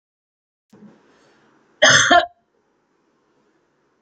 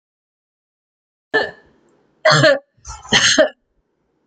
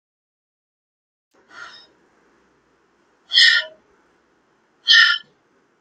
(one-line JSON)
{"cough_length": "4.0 s", "cough_amplitude": 29830, "cough_signal_mean_std_ratio": 0.26, "three_cough_length": "4.3 s", "three_cough_amplitude": 32101, "three_cough_signal_mean_std_ratio": 0.36, "exhalation_length": "5.8 s", "exhalation_amplitude": 31941, "exhalation_signal_mean_std_ratio": 0.26, "survey_phase": "beta (2021-08-13 to 2022-03-07)", "age": "45-64", "gender": "Female", "wearing_mask": "No", "symptom_none": true, "smoker_status": "Never smoked", "respiratory_condition_asthma": false, "respiratory_condition_other": false, "recruitment_source": "REACT", "submission_delay": "3 days", "covid_test_result": "Negative", "covid_test_method": "RT-qPCR"}